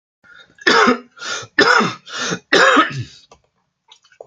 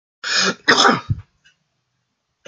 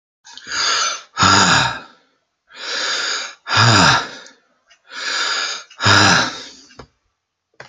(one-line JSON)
{"three_cough_length": "4.3 s", "three_cough_amplitude": 30892, "three_cough_signal_mean_std_ratio": 0.48, "cough_length": "2.5 s", "cough_amplitude": 32768, "cough_signal_mean_std_ratio": 0.4, "exhalation_length": "7.7 s", "exhalation_amplitude": 32767, "exhalation_signal_mean_std_ratio": 0.55, "survey_phase": "alpha (2021-03-01 to 2021-08-12)", "age": "18-44", "gender": "Male", "wearing_mask": "No", "symptom_none": true, "smoker_status": "Never smoked", "respiratory_condition_asthma": false, "respiratory_condition_other": false, "recruitment_source": "REACT", "submission_delay": "1 day", "covid_test_result": "Negative", "covid_test_method": "RT-qPCR"}